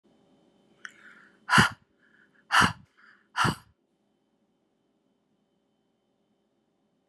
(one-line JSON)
{"exhalation_length": "7.1 s", "exhalation_amplitude": 23142, "exhalation_signal_mean_std_ratio": 0.22, "survey_phase": "beta (2021-08-13 to 2022-03-07)", "age": "18-44", "gender": "Female", "wearing_mask": "No", "symptom_none": true, "smoker_status": "Never smoked", "respiratory_condition_asthma": false, "respiratory_condition_other": false, "recruitment_source": "REACT", "submission_delay": "5 days", "covid_test_result": "Negative", "covid_test_method": "RT-qPCR"}